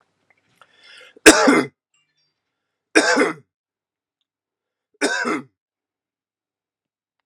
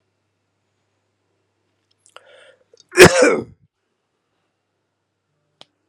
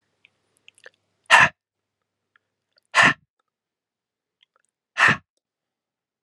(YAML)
three_cough_length: 7.3 s
three_cough_amplitude: 32768
three_cough_signal_mean_std_ratio: 0.27
cough_length: 5.9 s
cough_amplitude: 32768
cough_signal_mean_std_ratio: 0.19
exhalation_length: 6.2 s
exhalation_amplitude: 30218
exhalation_signal_mean_std_ratio: 0.23
survey_phase: beta (2021-08-13 to 2022-03-07)
age: 45-64
gender: Male
wearing_mask: 'No'
symptom_cough_any: true
symptom_runny_or_blocked_nose: true
symptom_sore_throat: true
symptom_change_to_sense_of_smell_or_taste: true
symptom_onset: 7 days
smoker_status: Ex-smoker
respiratory_condition_asthma: false
respiratory_condition_other: false
recruitment_source: Test and Trace
submission_delay: 1 day
covid_test_result: Positive
covid_test_method: RT-qPCR